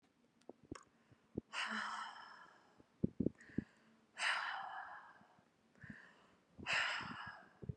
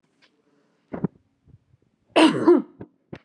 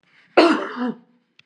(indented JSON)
{
  "exhalation_length": "7.8 s",
  "exhalation_amplitude": 3087,
  "exhalation_signal_mean_std_ratio": 0.45,
  "three_cough_length": "3.2 s",
  "three_cough_amplitude": 20468,
  "three_cough_signal_mean_std_ratio": 0.31,
  "cough_length": "1.5 s",
  "cough_amplitude": 31843,
  "cough_signal_mean_std_ratio": 0.41,
  "survey_phase": "beta (2021-08-13 to 2022-03-07)",
  "age": "45-64",
  "gender": "Female",
  "wearing_mask": "Yes",
  "symptom_none": true,
  "smoker_status": "Never smoked",
  "respiratory_condition_asthma": false,
  "respiratory_condition_other": false,
  "recruitment_source": "REACT",
  "submission_delay": "1 day",
  "covid_test_result": "Negative",
  "covid_test_method": "RT-qPCR",
  "influenza_a_test_result": "Negative",
  "influenza_b_test_result": "Negative"
}